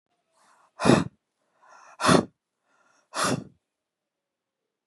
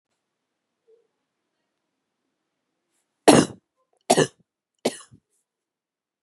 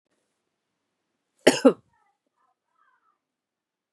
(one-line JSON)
{"exhalation_length": "4.9 s", "exhalation_amplitude": 24701, "exhalation_signal_mean_std_ratio": 0.27, "three_cough_length": "6.2 s", "three_cough_amplitude": 32767, "three_cough_signal_mean_std_ratio": 0.18, "cough_length": "3.9 s", "cough_amplitude": 31789, "cough_signal_mean_std_ratio": 0.15, "survey_phase": "beta (2021-08-13 to 2022-03-07)", "age": "18-44", "gender": "Female", "wearing_mask": "No", "symptom_runny_or_blocked_nose": true, "smoker_status": "Never smoked", "respiratory_condition_asthma": false, "respiratory_condition_other": false, "recruitment_source": "Test and Trace", "submission_delay": "2 days", "covid_test_result": "Positive", "covid_test_method": "ePCR"}